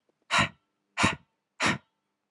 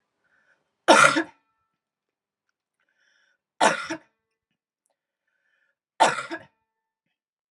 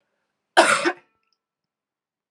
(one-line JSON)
{"exhalation_length": "2.3 s", "exhalation_amplitude": 12849, "exhalation_signal_mean_std_ratio": 0.37, "three_cough_length": "7.5 s", "three_cough_amplitude": 28819, "three_cough_signal_mean_std_ratio": 0.23, "cough_length": "2.3 s", "cough_amplitude": 32748, "cough_signal_mean_std_ratio": 0.28, "survey_phase": "beta (2021-08-13 to 2022-03-07)", "age": "18-44", "gender": "Female", "wearing_mask": "No", "symptom_cough_any": true, "symptom_runny_or_blocked_nose": true, "symptom_other": true, "smoker_status": "Ex-smoker", "respiratory_condition_asthma": false, "respiratory_condition_other": false, "recruitment_source": "Test and Trace", "submission_delay": "1 day", "covid_test_result": "Positive", "covid_test_method": "LFT"}